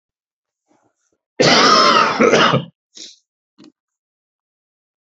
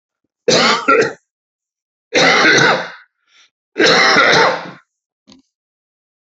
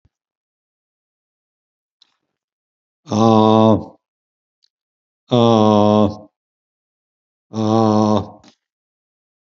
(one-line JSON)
{"cough_length": "5.0 s", "cough_amplitude": 32767, "cough_signal_mean_std_ratio": 0.41, "three_cough_length": "6.2 s", "three_cough_amplitude": 32767, "three_cough_signal_mean_std_ratio": 0.51, "exhalation_length": "9.5 s", "exhalation_amplitude": 27875, "exhalation_signal_mean_std_ratio": 0.37, "survey_phase": "beta (2021-08-13 to 2022-03-07)", "age": "65+", "gender": "Male", "wearing_mask": "No", "symptom_cough_any": true, "symptom_sore_throat": true, "smoker_status": "Never smoked", "respiratory_condition_asthma": false, "respiratory_condition_other": false, "recruitment_source": "Test and Trace", "submission_delay": "1 day", "covid_test_result": "Positive", "covid_test_method": "RT-qPCR", "covid_ct_value": 33.9, "covid_ct_gene": "ORF1ab gene", "covid_ct_mean": 35.0, "covid_viral_load": "3.4 copies/ml", "covid_viral_load_category": "Minimal viral load (< 10K copies/ml)"}